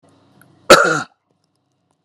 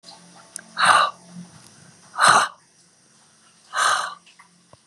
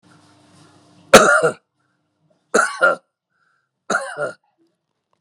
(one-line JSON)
{"cough_length": "2.0 s", "cough_amplitude": 32768, "cough_signal_mean_std_ratio": 0.28, "exhalation_length": "4.9 s", "exhalation_amplitude": 31069, "exhalation_signal_mean_std_ratio": 0.37, "three_cough_length": "5.2 s", "three_cough_amplitude": 32768, "three_cough_signal_mean_std_ratio": 0.3, "survey_phase": "beta (2021-08-13 to 2022-03-07)", "age": "45-64", "gender": "Female", "wearing_mask": "No", "symptom_none": true, "smoker_status": "Never smoked", "respiratory_condition_asthma": false, "respiratory_condition_other": false, "recruitment_source": "Test and Trace", "submission_delay": "3 days", "covid_test_result": "Positive", "covid_test_method": "RT-qPCR", "covid_ct_value": 23.1, "covid_ct_gene": "N gene"}